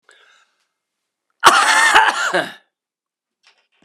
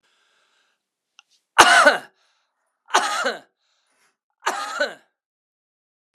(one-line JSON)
{"cough_length": "3.8 s", "cough_amplitude": 32768, "cough_signal_mean_std_ratio": 0.4, "three_cough_length": "6.1 s", "three_cough_amplitude": 32768, "three_cough_signal_mean_std_ratio": 0.29, "survey_phase": "beta (2021-08-13 to 2022-03-07)", "age": "45-64", "gender": "Male", "wearing_mask": "No", "symptom_cough_any": true, "symptom_new_continuous_cough": true, "symptom_shortness_of_breath": true, "symptom_sore_throat": true, "symptom_fatigue": true, "symptom_fever_high_temperature": true, "symptom_headache": true, "symptom_onset": "3 days", "smoker_status": "Ex-smoker", "respiratory_condition_asthma": false, "respiratory_condition_other": false, "recruitment_source": "Test and Trace", "submission_delay": "2 days", "covid_test_result": "Positive", "covid_test_method": "RT-qPCR", "covid_ct_value": 19.7, "covid_ct_gene": "ORF1ab gene", "covid_ct_mean": 20.2, "covid_viral_load": "240000 copies/ml", "covid_viral_load_category": "Low viral load (10K-1M copies/ml)"}